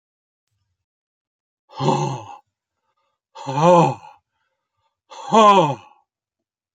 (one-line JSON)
{"exhalation_length": "6.7 s", "exhalation_amplitude": 29268, "exhalation_signal_mean_std_ratio": 0.33, "survey_phase": "beta (2021-08-13 to 2022-03-07)", "age": "65+", "gender": "Male", "wearing_mask": "No", "symptom_runny_or_blocked_nose": true, "symptom_sore_throat": true, "smoker_status": "Never smoked", "respiratory_condition_asthma": false, "respiratory_condition_other": false, "recruitment_source": "REACT", "submission_delay": "2 days", "covid_test_result": "Negative", "covid_test_method": "RT-qPCR"}